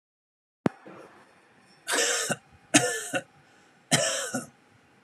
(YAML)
three_cough_length: 5.0 s
three_cough_amplitude: 21616
three_cough_signal_mean_std_ratio: 0.4
survey_phase: alpha (2021-03-01 to 2021-08-12)
age: 18-44
gender: Male
wearing_mask: 'No'
symptom_none: true
smoker_status: Never smoked
respiratory_condition_asthma: false
respiratory_condition_other: false
recruitment_source: REACT
submission_delay: 2 days
covid_test_result: Negative
covid_test_method: RT-qPCR